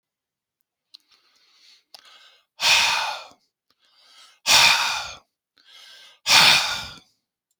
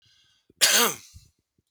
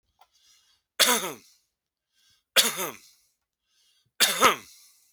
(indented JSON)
{
  "exhalation_length": "7.6 s",
  "exhalation_amplitude": 28027,
  "exhalation_signal_mean_std_ratio": 0.36,
  "cough_length": "1.7 s",
  "cough_amplitude": 25690,
  "cough_signal_mean_std_ratio": 0.35,
  "three_cough_length": "5.1 s",
  "three_cough_amplitude": 25576,
  "three_cough_signal_mean_std_ratio": 0.3,
  "survey_phase": "beta (2021-08-13 to 2022-03-07)",
  "age": "45-64",
  "gender": "Male",
  "wearing_mask": "No",
  "symptom_runny_or_blocked_nose": true,
  "smoker_status": "Ex-smoker",
  "respiratory_condition_asthma": false,
  "respiratory_condition_other": false,
  "recruitment_source": "REACT",
  "submission_delay": "1 day",
  "covid_test_result": "Negative",
  "covid_test_method": "RT-qPCR"
}